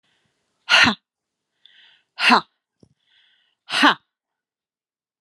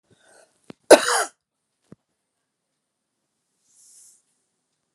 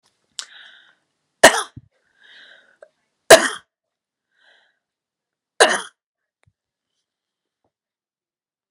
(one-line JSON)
{"exhalation_length": "5.2 s", "exhalation_amplitude": 31361, "exhalation_signal_mean_std_ratio": 0.27, "cough_length": "4.9 s", "cough_amplitude": 32768, "cough_signal_mean_std_ratio": 0.15, "three_cough_length": "8.7 s", "three_cough_amplitude": 32768, "three_cough_signal_mean_std_ratio": 0.17, "survey_phase": "alpha (2021-03-01 to 2021-08-12)", "age": "65+", "gender": "Female", "wearing_mask": "No", "symptom_loss_of_taste": true, "symptom_onset": "5 days", "smoker_status": "Ex-smoker", "respiratory_condition_asthma": false, "respiratory_condition_other": false, "recruitment_source": "Test and Trace", "submission_delay": "5 days", "covid_test_result": "Positive", "covid_test_method": "RT-qPCR"}